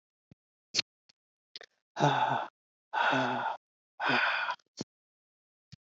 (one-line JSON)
{"exhalation_length": "5.8 s", "exhalation_amplitude": 8957, "exhalation_signal_mean_std_ratio": 0.45, "survey_phase": "alpha (2021-03-01 to 2021-08-12)", "age": "65+", "gender": "Female", "wearing_mask": "No", "symptom_cough_any": true, "symptom_shortness_of_breath": true, "smoker_status": "Never smoked", "respiratory_condition_asthma": false, "respiratory_condition_other": false, "recruitment_source": "REACT", "submission_delay": "2 days", "covid_test_result": "Negative", "covid_test_method": "RT-qPCR"}